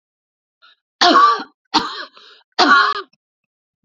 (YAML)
three_cough_length: 3.8 s
three_cough_amplitude: 30192
three_cough_signal_mean_std_ratio: 0.41
survey_phase: beta (2021-08-13 to 2022-03-07)
age: 45-64
gender: Female
wearing_mask: 'No'
symptom_sore_throat: true
smoker_status: Never smoked
respiratory_condition_asthma: false
respiratory_condition_other: false
recruitment_source: Test and Trace
submission_delay: 2 days
covid_test_result: Positive
covid_test_method: RT-qPCR
covid_ct_value: 30.3
covid_ct_gene: ORF1ab gene